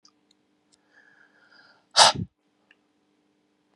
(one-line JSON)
{"exhalation_length": "3.8 s", "exhalation_amplitude": 30850, "exhalation_signal_mean_std_ratio": 0.18, "survey_phase": "beta (2021-08-13 to 2022-03-07)", "age": "45-64", "gender": "Male", "wearing_mask": "No", "symptom_cough_any": true, "symptom_runny_or_blocked_nose": true, "symptom_fatigue": true, "symptom_fever_high_temperature": true, "symptom_headache": true, "symptom_change_to_sense_of_smell_or_taste": true, "symptom_onset": "4 days", "smoker_status": "Ex-smoker", "respiratory_condition_asthma": false, "respiratory_condition_other": false, "recruitment_source": "Test and Trace", "submission_delay": "1 day", "covid_test_result": "Positive", "covid_test_method": "RT-qPCR", "covid_ct_value": 13.8, "covid_ct_gene": "ORF1ab gene", "covid_ct_mean": 14.0, "covid_viral_load": "25000000 copies/ml", "covid_viral_load_category": "High viral load (>1M copies/ml)"}